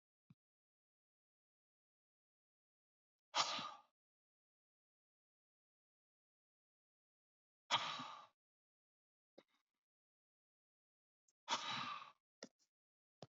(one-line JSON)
{"exhalation_length": "13.3 s", "exhalation_amplitude": 2296, "exhalation_signal_mean_std_ratio": 0.22, "survey_phase": "beta (2021-08-13 to 2022-03-07)", "age": "18-44", "gender": "Male", "wearing_mask": "No", "symptom_none": true, "smoker_status": "Ex-smoker", "respiratory_condition_asthma": false, "respiratory_condition_other": false, "recruitment_source": "REACT", "submission_delay": "4 days", "covid_test_result": "Negative", "covid_test_method": "RT-qPCR", "influenza_a_test_result": "Negative", "influenza_b_test_result": "Negative"}